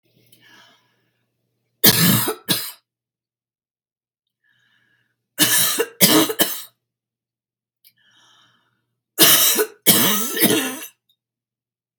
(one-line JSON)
{"three_cough_length": "12.0 s", "three_cough_amplitude": 32768, "three_cough_signal_mean_std_ratio": 0.38, "survey_phase": "beta (2021-08-13 to 2022-03-07)", "age": "45-64", "gender": "Female", "wearing_mask": "No", "symptom_shortness_of_breath": true, "symptom_fatigue": true, "smoker_status": "Never smoked", "respiratory_condition_asthma": false, "respiratory_condition_other": true, "recruitment_source": "REACT", "submission_delay": "3 days", "covid_test_result": "Negative", "covid_test_method": "RT-qPCR", "influenza_a_test_result": "Negative", "influenza_b_test_result": "Negative"}